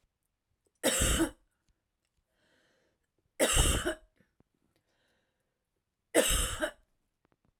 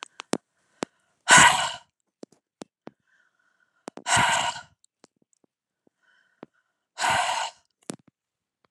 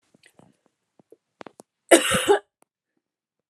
{"three_cough_length": "7.6 s", "three_cough_amplitude": 9153, "three_cough_signal_mean_std_ratio": 0.35, "exhalation_length": "8.7 s", "exhalation_amplitude": 27659, "exhalation_signal_mean_std_ratio": 0.28, "cough_length": "3.5 s", "cough_amplitude": 32241, "cough_signal_mean_std_ratio": 0.24, "survey_phase": "alpha (2021-03-01 to 2021-08-12)", "age": "45-64", "gender": "Female", "wearing_mask": "No", "symptom_none": true, "smoker_status": "Ex-smoker", "respiratory_condition_asthma": false, "respiratory_condition_other": false, "recruitment_source": "REACT", "submission_delay": "1 day", "covid_test_result": "Negative", "covid_test_method": "RT-qPCR"}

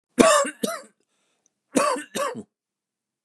{"cough_length": "3.2 s", "cough_amplitude": 32768, "cough_signal_mean_std_ratio": 0.38, "survey_phase": "beta (2021-08-13 to 2022-03-07)", "age": "45-64", "gender": "Male", "wearing_mask": "No", "symptom_cough_any": true, "smoker_status": "Never smoked", "respiratory_condition_asthma": false, "respiratory_condition_other": false, "recruitment_source": "REACT", "submission_delay": "2 days", "covid_test_result": "Negative", "covid_test_method": "RT-qPCR", "influenza_a_test_result": "Negative", "influenza_b_test_result": "Negative"}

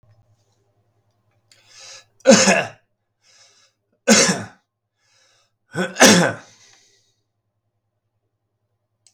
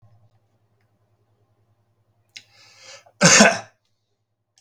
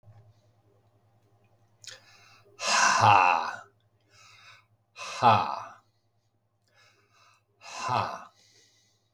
{"three_cough_length": "9.1 s", "three_cough_amplitude": 32768, "three_cough_signal_mean_std_ratio": 0.27, "cough_length": "4.6 s", "cough_amplitude": 32768, "cough_signal_mean_std_ratio": 0.22, "exhalation_length": "9.1 s", "exhalation_amplitude": 17614, "exhalation_signal_mean_std_ratio": 0.33, "survey_phase": "beta (2021-08-13 to 2022-03-07)", "age": "65+", "gender": "Male", "wearing_mask": "No", "symptom_sore_throat": true, "smoker_status": "Ex-smoker", "respiratory_condition_asthma": false, "respiratory_condition_other": false, "recruitment_source": "Test and Trace", "submission_delay": "2 days", "covid_test_result": "Positive", "covid_test_method": "RT-qPCR", "covid_ct_value": 21.8, "covid_ct_gene": "ORF1ab gene", "covid_ct_mean": 22.4, "covid_viral_load": "45000 copies/ml", "covid_viral_load_category": "Low viral load (10K-1M copies/ml)"}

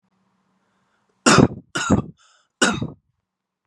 {"three_cough_length": "3.7 s", "three_cough_amplitude": 32578, "three_cough_signal_mean_std_ratio": 0.32, "survey_phase": "beta (2021-08-13 to 2022-03-07)", "age": "18-44", "gender": "Male", "wearing_mask": "No", "symptom_none": true, "smoker_status": "Never smoked", "respiratory_condition_asthma": false, "respiratory_condition_other": false, "recruitment_source": "REACT", "submission_delay": "2 days", "covid_test_result": "Negative", "covid_test_method": "RT-qPCR", "influenza_a_test_result": "Unknown/Void", "influenza_b_test_result": "Unknown/Void"}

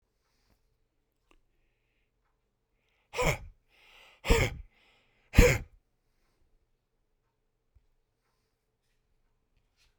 {"exhalation_length": "10.0 s", "exhalation_amplitude": 17984, "exhalation_signal_mean_std_ratio": 0.19, "survey_phase": "beta (2021-08-13 to 2022-03-07)", "age": "65+", "gender": "Male", "wearing_mask": "No", "symptom_none": true, "smoker_status": "Never smoked", "respiratory_condition_asthma": false, "respiratory_condition_other": false, "recruitment_source": "REACT", "submission_delay": "5 days", "covid_test_result": "Negative", "covid_test_method": "RT-qPCR"}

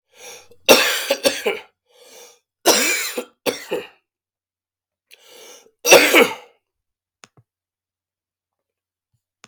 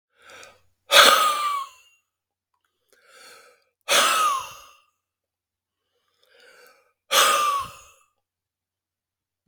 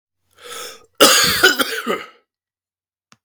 {"three_cough_length": "9.5 s", "three_cough_amplitude": 32768, "three_cough_signal_mean_std_ratio": 0.32, "exhalation_length": "9.5 s", "exhalation_amplitude": 32768, "exhalation_signal_mean_std_ratio": 0.34, "cough_length": "3.2 s", "cough_amplitude": 32768, "cough_signal_mean_std_ratio": 0.41, "survey_phase": "beta (2021-08-13 to 2022-03-07)", "age": "45-64", "gender": "Male", "wearing_mask": "No", "symptom_cough_any": true, "symptom_runny_or_blocked_nose": true, "symptom_shortness_of_breath": true, "symptom_fatigue": true, "symptom_change_to_sense_of_smell_or_taste": true, "symptom_loss_of_taste": true, "symptom_onset": "4 days", "smoker_status": "Ex-smoker", "respiratory_condition_asthma": true, "respiratory_condition_other": false, "recruitment_source": "Test and Trace", "submission_delay": "1 day", "covid_test_result": "Positive", "covid_test_method": "RT-qPCR", "covid_ct_value": 19.6, "covid_ct_gene": "ORF1ab gene", "covid_ct_mean": 20.1, "covid_viral_load": "250000 copies/ml", "covid_viral_load_category": "Low viral load (10K-1M copies/ml)"}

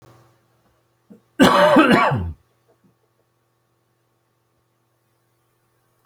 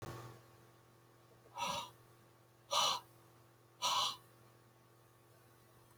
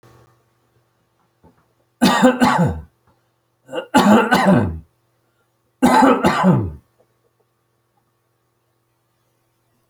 {"cough_length": "6.1 s", "cough_amplitude": 28446, "cough_signal_mean_std_ratio": 0.31, "exhalation_length": "6.0 s", "exhalation_amplitude": 3266, "exhalation_signal_mean_std_ratio": 0.39, "three_cough_length": "9.9 s", "three_cough_amplitude": 31073, "three_cough_signal_mean_std_ratio": 0.41, "survey_phase": "beta (2021-08-13 to 2022-03-07)", "age": "65+", "gender": "Male", "wearing_mask": "No", "symptom_cough_any": true, "symptom_runny_or_blocked_nose": true, "symptom_diarrhoea": true, "symptom_fatigue": true, "symptom_fever_high_temperature": true, "symptom_headache": true, "symptom_onset": "3 days", "smoker_status": "Never smoked", "respiratory_condition_asthma": false, "respiratory_condition_other": false, "recruitment_source": "Test and Trace", "submission_delay": "2 days", "covid_test_result": "Positive", "covid_test_method": "RT-qPCR", "covid_ct_value": 15.9, "covid_ct_gene": "ORF1ab gene"}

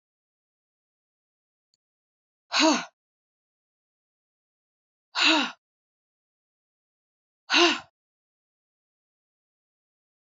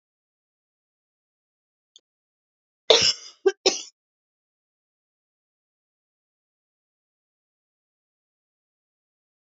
{"exhalation_length": "10.2 s", "exhalation_amplitude": 16636, "exhalation_signal_mean_std_ratio": 0.23, "cough_length": "9.5 s", "cough_amplitude": 29836, "cough_signal_mean_std_ratio": 0.15, "survey_phase": "beta (2021-08-13 to 2022-03-07)", "age": "45-64", "gender": "Male", "wearing_mask": "No", "symptom_cough_any": true, "symptom_runny_or_blocked_nose": true, "symptom_fatigue": true, "symptom_fever_high_temperature": true, "symptom_headache": true, "symptom_change_to_sense_of_smell_or_taste": true, "symptom_onset": "2 days", "smoker_status": "Never smoked", "respiratory_condition_asthma": false, "respiratory_condition_other": false, "recruitment_source": "Test and Trace", "submission_delay": "0 days", "covid_test_result": "Positive", "covid_test_method": "RT-qPCR", "covid_ct_value": 15.3, "covid_ct_gene": "ORF1ab gene", "covid_ct_mean": 15.7, "covid_viral_load": "6900000 copies/ml", "covid_viral_load_category": "High viral load (>1M copies/ml)"}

